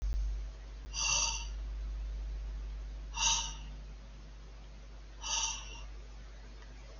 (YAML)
exhalation_length: 7.0 s
exhalation_amplitude: 4899
exhalation_signal_mean_std_ratio: 0.91
survey_phase: beta (2021-08-13 to 2022-03-07)
age: 65+
gender: Male
wearing_mask: 'No'
symptom_none: true
smoker_status: Never smoked
respiratory_condition_asthma: false
respiratory_condition_other: false
recruitment_source: REACT
submission_delay: 2 days
covid_test_result: Negative
covid_test_method: RT-qPCR
influenza_a_test_result: Negative
influenza_b_test_result: Negative